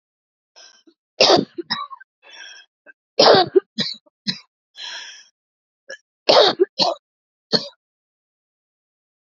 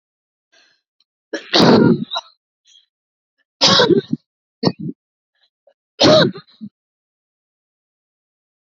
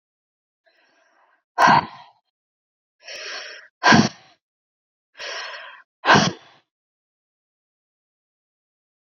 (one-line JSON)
{"three_cough_length": "9.2 s", "three_cough_amplitude": 32767, "three_cough_signal_mean_std_ratio": 0.31, "cough_length": "8.7 s", "cough_amplitude": 31533, "cough_signal_mean_std_ratio": 0.33, "exhalation_length": "9.1 s", "exhalation_amplitude": 29048, "exhalation_signal_mean_std_ratio": 0.26, "survey_phase": "beta (2021-08-13 to 2022-03-07)", "age": "18-44", "gender": "Female", "wearing_mask": "No", "symptom_cough_any": true, "smoker_status": "Current smoker (e-cigarettes or vapes only)", "respiratory_condition_asthma": true, "respiratory_condition_other": false, "recruitment_source": "REACT", "submission_delay": "2 days", "covid_test_result": "Negative", "covid_test_method": "RT-qPCR"}